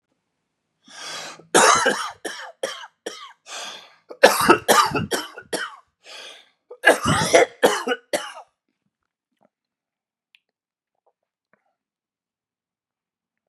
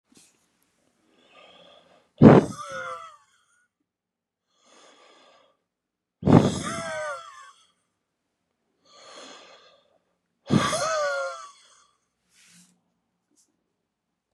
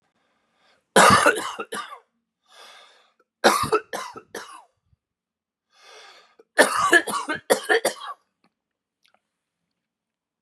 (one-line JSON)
{"cough_length": "13.5 s", "cough_amplitude": 32768, "cough_signal_mean_std_ratio": 0.33, "exhalation_length": "14.3 s", "exhalation_amplitude": 32766, "exhalation_signal_mean_std_ratio": 0.24, "three_cough_length": "10.4 s", "three_cough_amplitude": 29308, "three_cough_signal_mean_std_ratio": 0.32, "survey_phase": "beta (2021-08-13 to 2022-03-07)", "age": "45-64", "gender": "Male", "wearing_mask": "No", "symptom_fatigue": true, "symptom_change_to_sense_of_smell_or_taste": true, "symptom_onset": "12 days", "smoker_status": "Ex-smoker", "respiratory_condition_asthma": false, "respiratory_condition_other": false, "recruitment_source": "REACT", "submission_delay": "1 day", "covid_test_result": "Negative", "covid_test_method": "RT-qPCR", "influenza_a_test_result": "Negative", "influenza_b_test_result": "Negative"}